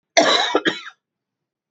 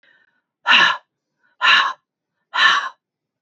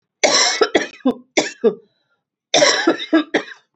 {"cough_length": "1.7 s", "cough_amplitude": 28998, "cough_signal_mean_std_ratio": 0.44, "exhalation_length": "3.4 s", "exhalation_amplitude": 29009, "exhalation_signal_mean_std_ratio": 0.42, "three_cough_length": "3.8 s", "three_cough_amplitude": 31323, "three_cough_signal_mean_std_ratio": 0.52, "survey_phase": "beta (2021-08-13 to 2022-03-07)", "age": "45-64", "gender": "Female", "wearing_mask": "No", "symptom_cough_any": true, "symptom_new_continuous_cough": true, "symptom_runny_or_blocked_nose": true, "symptom_sore_throat": true, "symptom_fatigue": true, "symptom_fever_high_temperature": true, "symptom_headache": true, "symptom_onset": "1 day", "smoker_status": "Never smoked", "respiratory_condition_asthma": true, "respiratory_condition_other": false, "recruitment_source": "Test and Trace", "submission_delay": "1 day", "covid_test_result": "Negative", "covid_test_method": "ePCR"}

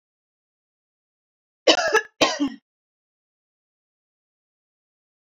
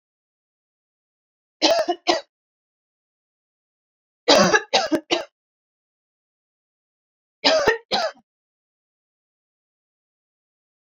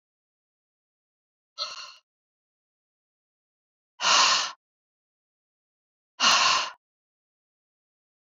{"cough_length": "5.4 s", "cough_amplitude": 29041, "cough_signal_mean_std_ratio": 0.24, "three_cough_length": "10.9 s", "three_cough_amplitude": 27221, "three_cough_signal_mean_std_ratio": 0.29, "exhalation_length": "8.4 s", "exhalation_amplitude": 14251, "exhalation_signal_mean_std_ratio": 0.28, "survey_phase": "beta (2021-08-13 to 2022-03-07)", "age": "45-64", "gender": "Female", "wearing_mask": "No", "symptom_none": true, "smoker_status": "Never smoked", "respiratory_condition_asthma": true, "respiratory_condition_other": false, "recruitment_source": "REACT", "submission_delay": "3 days", "covid_test_result": "Negative", "covid_test_method": "RT-qPCR", "influenza_a_test_result": "Negative", "influenza_b_test_result": "Negative"}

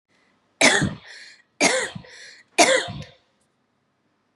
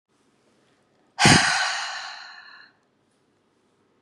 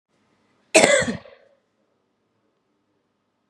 {"three_cough_length": "4.4 s", "three_cough_amplitude": 25464, "three_cough_signal_mean_std_ratio": 0.37, "exhalation_length": "4.0 s", "exhalation_amplitude": 31442, "exhalation_signal_mean_std_ratio": 0.33, "cough_length": "3.5 s", "cough_amplitude": 32768, "cough_signal_mean_std_ratio": 0.25, "survey_phase": "beta (2021-08-13 to 2022-03-07)", "age": "45-64", "gender": "Female", "wearing_mask": "No", "symptom_cough_any": true, "symptom_runny_or_blocked_nose": true, "symptom_sore_throat": true, "symptom_fatigue": true, "symptom_headache": true, "symptom_change_to_sense_of_smell_or_taste": true, "symptom_onset": "7 days", "smoker_status": "Never smoked", "respiratory_condition_asthma": false, "respiratory_condition_other": false, "recruitment_source": "Test and Trace", "submission_delay": "2 days", "covid_test_result": "Positive", "covid_test_method": "RT-qPCR", "covid_ct_value": 21.7, "covid_ct_gene": "ORF1ab gene", "covid_ct_mean": 22.0, "covid_viral_load": "59000 copies/ml", "covid_viral_load_category": "Low viral load (10K-1M copies/ml)"}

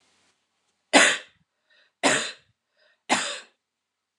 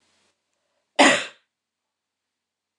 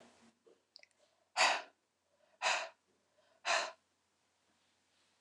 {"three_cough_length": "4.2 s", "three_cough_amplitude": 29094, "three_cough_signal_mean_std_ratio": 0.3, "cough_length": "2.8 s", "cough_amplitude": 26314, "cough_signal_mean_std_ratio": 0.22, "exhalation_length": "5.2 s", "exhalation_amplitude": 4742, "exhalation_signal_mean_std_ratio": 0.29, "survey_phase": "beta (2021-08-13 to 2022-03-07)", "age": "45-64", "gender": "Female", "wearing_mask": "No", "symptom_none": true, "smoker_status": "Never smoked", "respiratory_condition_asthma": false, "respiratory_condition_other": false, "recruitment_source": "REACT", "submission_delay": "2 days", "covid_test_result": "Negative", "covid_test_method": "RT-qPCR", "influenza_a_test_result": "Negative", "influenza_b_test_result": "Negative"}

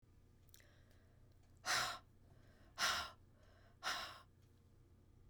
{"exhalation_length": "5.3 s", "exhalation_amplitude": 2232, "exhalation_signal_mean_std_ratio": 0.41, "survey_phase": "beta (2021-08-13 to 2022-03-07)", "age": "65+", "gender": "Female", "wearing_mask": "No", "symptom_none": true, "smoker_status": "Never smoked", "respiratory_condition_asthma": false, "respiratory_condition_other": false, "recruitment_source": "REACT", "submission_delay": "4 days", "covid_test_result": "Negative", "covid_test_method": "RT-qPCR", "influenza_a_test_result": "Negative", "influenza_b_test_result": "Negative"}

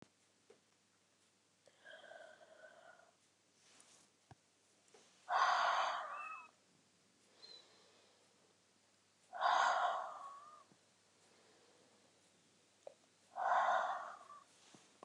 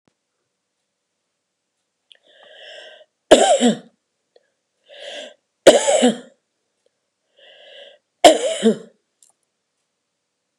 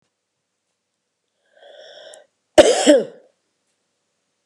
{"exhalation_length": "15.0 s", "exhalation_amplitude": 2594, "exhalation_signal_mean_std_ratio": 0.36, "three_cough_length": "10.6 s", "three_cough_amplitude": 32768, "three_cough_signal_mean_std_ratio": 0.27, "cough_length": "4.5 s", "cough_amplitude": 32768, "cough_signal_mean_std_ratio": 0.24, "survey_phase": "beta (2021-08-13 to 2022-03-07)", "age": "65+", "gender": "Female", "wearing_mask": "No", "symptom_cough_any": true, "smoker_status": "Never smoked", "respiratory_condition_asthma": false, "respiratory_condition_other": false, "recruitment_source": "REACT", "submission_delay": "3 days", "covid_test_result": "Negative", "covid_test_method": "RT-qPCR", "influenza_a_test_result": "Unknown/Void", "influenza_b_test_result": "Unknown/Void"}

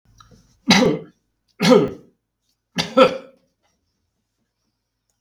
{"three_cough_length": "5.2 s", "three_cough_amplitude": 32766, "three_cough_signal_mean_std_ratio": 0.31, "survey_phase": "beta (2021-08-13 to 2022-03-07)", "age": "45-64", "gender": "Male", "wearing_mask": "No", "symptom_cough_any": true, "symptom_new_continuous_cough": true, "symptom_runny_or_blocked_nose": true, "symptom_fatigue": true, "symptom_headache": true, "symptom_change_to_sense_of_smell_or_taste": true, "smoker_status": "Never smoked", "respiratory_condition_asthma": false, "respiratory_condition_other": false, "recruitment_source": "Test and Trace", "submission_delay": "0 days", "covid_test_result": "Positive", "covid_test_method": "LFT"}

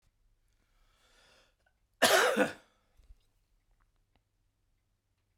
{"cough_length": "5.4 s", "cough_amplitude": 10435, "cough_signal_mean_std_ratio": 0.24, "survey_phase": "beta (2021-08-13 to 2022-03-07)", "age": "65+", "gender": "Male", "wearing_mask": "No", "symptom_cough_any": true, "symptom_runny_or_blocked_nose": true, "symptom_shortness_of_breath": true, "symptom_sore_throat": true, "symptom_diarrhoea": true, "symptom_other": true, "symptom_onset": "8 days", "smoker_status": "Ex-smoker", "respiratory_condition_asthma": false, "respiratory_condition_other": false, "recruitment_source": "Test and Trace", "submission_delay": "2 days", "covid_test_result": "Positive", "covid_test_method": "RT-qPCR", "covid_ct_value": 18.4, "covid_ct_gene": "ORF1ab gene", "covid_ct_mean": 18.6, "covid_viral_load": "790000 copies/ml", "covid_viral_load_category": "Low viral load (10K-1M copies/ml)"}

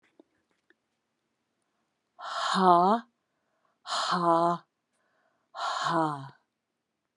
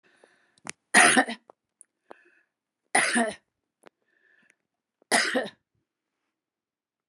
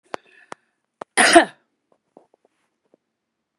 {"exhalation_length": "7.2 s", "exhalation_amplitude": 13990, "exhalation_signal_mean_std_ratio": 0.4, "three_cough_length": "7.1 s", "three_cough_amplitude": 22636, "three_cough_signal_mean_std_ratio": 0.28, "cough_length": "3.6 s", "cough_amplitude": 32768, "cough_signal_mean_std_ratio": 0.21, "survey_phase": "beta (2021-08-13 to 2022-03-07)", "age": "65+", "gender": "Female", "wearing_mask": "No", "symptom_none": true, "smoker_status": "Ex-smoker", "respiratory_condition_asthma": false, "respiratory_condition_other": false, "recruitment_source": "REACT", "submission_delay": "1 day", "covid_test_result": "Negative", "covid_test_method": "RT-qPCR"}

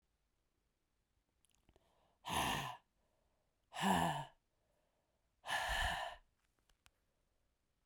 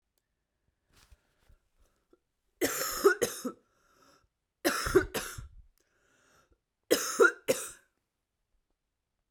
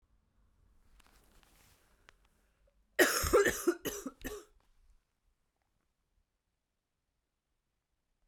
{"exhalation_length": "7.9 s", "exhalation_amplitude": 2496, "exhalation_signal_mean_std_ratio": 0.37, "three_cough_length": "9.3 s", "three_cough_amplitude": 9613, "three_cough_signal_mean_std_ratio": 0.3, "cough_length": "8.3 s", "cough_amplitude": 8545, "cough_signal_mean_std_ratio": 0.25, "survey_phase": "beta (2021-08-13 to 2022-03-07)", "age": "18-44", "gender": "Female", "wearing_mask": "No", "symptom_cough_any": true, "symptom_runny_or_blocked_nose": true, "symptom_shortness_of_breath": true, "symptom_sore_throat": true, "symptom_fatigue": true, "symptom_fever_high_temperature": true, "symptom_headache": true, "smoker_status": "Never smoked", "respiratory_condition_asthma": false, "respiratory_condition_other": false, "recruitment_source": "Test and Trace", "submission_delay": "2 days", "covid_test_result": "Positive", "covid_test_method": "RT-qPCR", "covid_ct_value": 21.1, "covid_ct_gene": "ORF1ab gene", "covid_ct_mean": 21.4, "covid_viral_load": "94000 copies/ml", "covid_viral_load_category": "Low viral load (10K-1M copies/ml)"}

